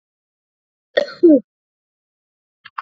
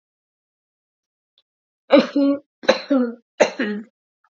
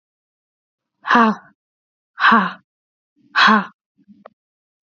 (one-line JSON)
{"cough_length": "2.8 s", "cough_amplitude": 28975, "cough_signal_mean_std_ratio": 0.24, "three_cough_length": "4.4 s", "three_cough_amplitude": 31581, "three_cough_signal_mean_std_ratio": 0.36, "exhalation_length": "4.9 s", "exhalation_amplitude": 31191, "exhalation_signal_mean_std_ratio": 0.33, "survey_phase": "beta (2021-08-13 to 2022-03-07)", "age": "18-44", "gender": "Female", "wearing_mask": "No", "symptom_new_continuous_cough": true, "symptom_runny_or_blocked_nose": true, "symptom_sore_throat": true, "symptom_fatigue": true, "symptom_headache": true, "symptom_onset": "3 days", "smoker_status": "Never smoked", "respiratory_condition_asthma": false, "respiratory_condition_other": false, "recruitment_source": "Test and Trace", "submission_delay": "1 day", "covid_test_result": "Positive", "covid_test_method": "RT-qPCR", "covid_ct_value": 17.2, "covid_ct_gene": "N gene"}